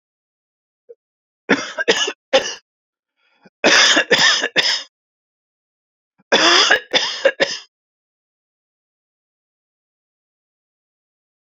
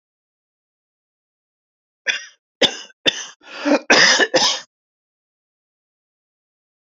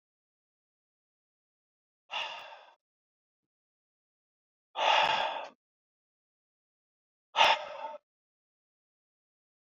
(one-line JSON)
{"three_cough_length": "11.5 s", "three_cough_amplitude": 31232, "three_cough_signal_mean_std_ratio": 0.36, "cough_length": "6.8 s", "cough_amplitude": 31563, "cough_signal_mean_std_ratio": 0.31, "exhalation_length": "9.6 s", "exhalation_amplitude": 13911, "exhalation_signal_mean_std_ratio": 0.26, "survey_phase": "beta (2021-08-13 to 2022-03-07)", "age": "45-64", "gender": "Male", "wearing_mask": "No", "symptom_runny_or_blocked_nose": true, "smoker_status": "Never smoked", "respiratory_condition_asthma": false, "respiratory_condition_other": false, "recruitment_source": "REACT", "submission_delay": "1 day", "covid_test_result": "Negative", "covid_test_method": "RT-qPCR"}